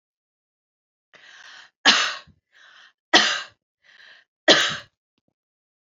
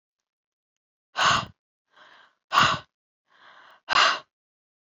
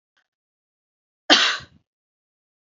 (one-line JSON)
{"three_cough_length": "5.8 s", "three_cough_amplitude": 32144, "three_cough_signal_mean_std_ratio": 0.28, "exhalation_length": "4.9 s", "exhalation_amplitude": 17524, "exhalation_signal_mean_std_ratio": 0.32, "cough_length": "2.6 s", "cough_amplitude": 31162, "cough_signal_mean_std_ratio": 0.23, "survey_phase": "alpha (2021-03-01 to 2021-08-12)", "age": "18-44", "gender": "Female", "wearing_mask": "No", "symptom_none": true, "smoker_status": "Never smoked", "respiratory_condition_asthma": false, "respiratory_condition_other": false, "recruitment_source": "REACT", "submission_delay": "1 day", "covid_test_result": "Negative", "covid_test_method": "RT-qPCR"}